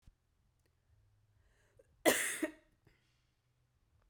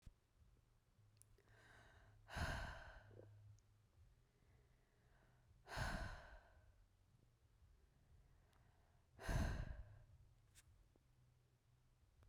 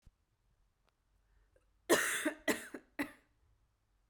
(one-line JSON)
{"cough_length": "4.1 s", "cough_amplitude": 6201, "cough_signal_mean_std_ratio": 0.23, "exhalation_length": "12.3 s", "exhalation_amplitude": 811, "exhalation_signal_mean_std_ratio": 0.39, "three_cough_length": "4.1 s", "three_cough_amplitude": 6594, "three_cough_signal_mean_std_ratio": 0.3, "survey_phase": "beta (2021-08-13 to 2022-03-07)", "age": "18-44", "gender": "Female", "wearing_mask": "No", "symptom_cough_any": true, "symptom_runny_or_blocked_nose": true, "symptom_fatigue": true, "symptom_headache": true, "symptom_change_to_sense_of_smell_or_taste": true, "symptom_loss_of_taste": true, "symptom_onset": "6 days", "smoker_status": "Never smoked", "respiratory_condition_asthma": false, "respiratory_condition_other": false, "recruitment_source": "Test and Trace", "submission_delay": "2 days", "covid_test_result": "Positive", "covid_test_method": "RT-qPCR", "covid_ct_value": 19.2, "covid_ct_gene": "N gene"}